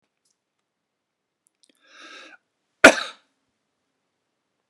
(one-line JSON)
{"cough_length": "4.7 s", "cough_amplitude": 32768, "cough_signal_mean_std_ratio": 0.12, "survey_phase": "beta (2021-08-13 to 2022-03-07)", "age": "65+", "gender": "Male", "wearing_mask": "No", "symptom_none": true, "smoker_status": "Ex-smoker", "respiratory_condition_asthma": false, "respiratory_condition_other": false, "recruitment_source": "REACT", "submission_delay": "1 day", "covid_test_result": "Negative", "covid_test_method": "RT-qPCR"}